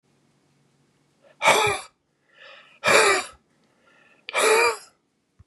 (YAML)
exhalation_length: 5.5 s
exhalation_amplitude: 27872
exhalation_signal_mean_std_ratio: 0.39
survey_phase: beta (2021-08-13 to 2022-03-07)
age: 65+
gender: Male
wearing_mask: 'No'
symptom_cough_any: true
symptom_runny_or_blocked_nose: true
symptom_diarrhoea: true
symptom_fatigue: true
symptom_fever_high_temperature: true
symptom_change_to_sense_of_smell_or_taste: true
symptom_loss_of_taste: true
symptom_onset: 8 days
smoker_status: Never smoked
respiratory_condition_asthma: false
respiratory_condition_other: false
recruitment_source: Test and Trace
submission_delay: 3 days
covid_test_result: Positive
covid_test_method: RT-qPCR